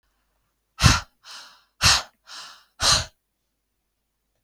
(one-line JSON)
{"exhalation_length": "4.4 s", "exhalation_amplitude": 31554, "exhalation_signal_mean_std_ratio": 0.3, "survey_phase": "beta (2021-08-13 to 2022-03-07)", "age": "18-44", "gender": "Female", "wearing_mask": "No", "symptom_none": true, "smoker_status": "Never smoked", "respiratory_condition_asthma": false, "respiratory_condition_other": false, "recruitment_source": "REACT", "submission_delay": "1 day", "covid_test_result": "Negative", "covid_test_method": "RT-qPCR"}